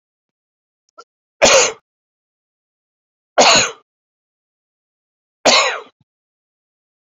{
  "three_cough_length": "7.2 s",
  "three_cough_amplitude": 32767,
  "three_cough_signal_mean_std_ratio": 0.28,
  "survey_phase": "beta (2021-08-13 to 2022-03-07)",
  "age": "65+",
  "gender": "Male",
  "wearing_mask": "No",
  "symptom_cough_any": true,
  "symptom_onset": "12 days",
  "smoker_status": "Never smoked",
  "respiratory_condition_asthma": true,
  "respiratory_condition_other": true,
  "recruitment_source": "REACT",
  "submission_delay": "7 days",
  "covid_test_result": "Negative",
  "covid_test_method": "RT-qPCR"
}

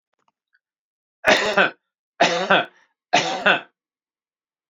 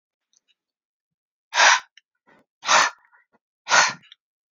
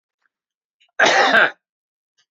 {
  "three_cough_length": "4.7 s",
  "three_cough_amplitude": 32767,
  "three_cough_signal_mean_std_ratio": 0.38,
  "exhalation_length": "4.5 s",
  "exhalation_amplitude": 27508,
  "exhalation_signal_mean_std_ratio": 0.31,
  "cough_length": "2.3 s",
  "cough_amplitude": 29194,
  "cough_signal_mean_std_ratio": 0.38,
  "survey_phase": "beta (2021-08-13 to 2022-03-07)",
  "age": "65+",
  "gender": "Male",
  "wearing_mask": "No",
  "symptom_none": true,
  "smoker_status": "Never smoked",
  "respiratory_condition_asthma": false,
  "respiratory_condition_other": false,
  "recruitment_source": "Test and Trace",
  "submission_delay": "0 days",
  "covid_test_result": "Negative",
  "covid_test_method": "LFT"
}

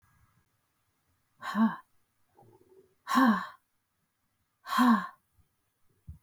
{
  "exhalation_length": "6.2 s",
  "exhalation_amplitude": 8171,
  "exhalation_signal_mean_std_ratio": 0.32,
  "survey_phase": "beta (2021-08-13 to 2022-03-07)",
  "age": "45-64",
  "gender": "Female",
  "wearing_mask": "No",
  "symptom_none": true,
  "smoker_status": "Never smoked",
  "respiratory_condition_asthma": false,
  "respiratory_condition_other": false,
  "recruitment_source": "REACT",
  "submission_delay": "1 day",
  "covid_test_result": "Negative",
  "covid_test_method": "RT-qPCR",
  "influenza_a_test_result": "Negative",
  "influenza_b_test_result": "Negative"
}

